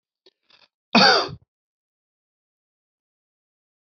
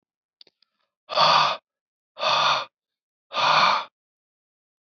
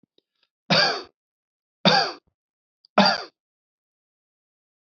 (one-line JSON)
{"cough_length": "3.8 s", "cough_amplitude": 25117, "cough_signal_mean_std_ratio": 0.23, "exhalation_length": "4.9 s", "exhalation_amplitude": 17937, "exhalation_signal_mean_std_ratio": 0.43, "three_cough_length": "4.9 s", "three_cough_amplitude": 23819, "three_cough_signal_mean_std_ratio": 0.3, "survey_phase": "alpha (2021-03-01 to 2021-08-12)", "age": "45-64", "gender": "Male", "wearing_mask": "No", "symptom_none": true, "smoker_status": "Ex-smoker", "respiratory_condition_asthma": false, "respiratory_condition_other": false, "recruitment_source": "REACT", "submission_delay": "1 day", "covid_test_result": "Negative", "covid_test_method": "RT-qPCR"}